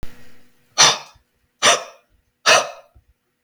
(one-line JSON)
{"exhalation_length": "3.4 s", "exhalation_amplitude": 32768, "exhalation_signal_mean_std_ratio": 0.35, "survey_phase": "beta (2021-08-13 to 2022-03-07)", "age": "45-64", "gender": "Male", "wearing_mask": "No", "symptom_none": true, "smoker_status": "Never smoked", "respiratory_condition_asthma": false, "respiratory_condition_other": false, "recruitment_source": "REACT", "submission_delay": "0 days", "covid_test_result": "Negative", "covid_test_method": "RT-qPCR", "influenza_a_test_result": "Negative", "influenza_b_test_result": "Negative"}